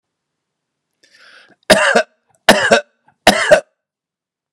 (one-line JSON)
{"three_cough_length": "4.5 s", "three_cough_amplitude": 32768, "three_cough_signal_mean_std_ratio": 0.35, "survey_phase": "beta (2021-08-13 to 2022-03-07)", "age": "45-64", "gender": "Male", "wearing_mask": "No", "symptom_fatigue": true, "symptom_onset": "13 days", "smoker_status": "Never smoked", "respiratory_condition_asthma": false, "respiratory_condition_other": false, "recruitment_source": "REACT", "submission_delay": "7 days", "covid_test_result": "Negative", "covid_test_method": "RT-qPCR"}